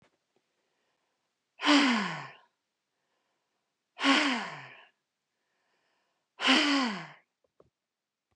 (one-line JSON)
{"exhalation_length": "8.4 s", "exhalation_amplitude": 11025, "exhalation_signal_mean_std_ratio": 0.35, "survey_phase": "beta (2021-08-13 to 2022-03-07)", "age": "45-64", "gender": "Female", "wearing_mask": "No", "symptom_none": true, "smoker_status": "Never smoked", "respiratory_condition_asthma": false, "respiratory_condition_other": false, "recruitment_source": "REACT", "submission_delay": "2 days", "covid_test_result": "Negative", "covid_test_method": "RT-qPCR", "influenza_a_test_result": "Negative", "influenza_b_test_result": "Negative"}